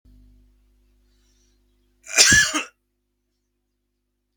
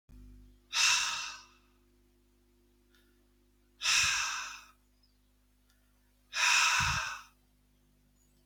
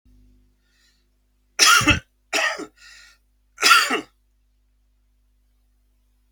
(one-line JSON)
{"cough_length": "4.4 s", "cough_amplitude": 32768, "cough_signal_mean_std_ratio": 0.25, "exhalation_length": "8.5 s", "exhalation_amplitude": 6628, "exhalation_signal_mean_std_ratio": 0.41, "three_cough_length": "6.3 s", "three_cough_amplitude": 32104, "three_cough_signal_mean_std_ratio": 0.31, "survey_phase": "beta (2021-08-13 to 2022-03-07)", "age": "45-64", "gender": "Male", "wearing_mask": "No", "symptom_cough_any": true, "symptom_runny_or_blocked_nose": true, "symptom_sore_throat": true, "symptom_change_to_sense_of_smell_or_taste": true, "smoker_status": "Ex-smoker", "respiratory_condition_asthma": false, "respiratory_condition_other": false, "recruitment_source": "Test and Trace", "submission_delay": "1 day", "covid_test_result": "Positive", "covid_test_method": "RT-qPCR"}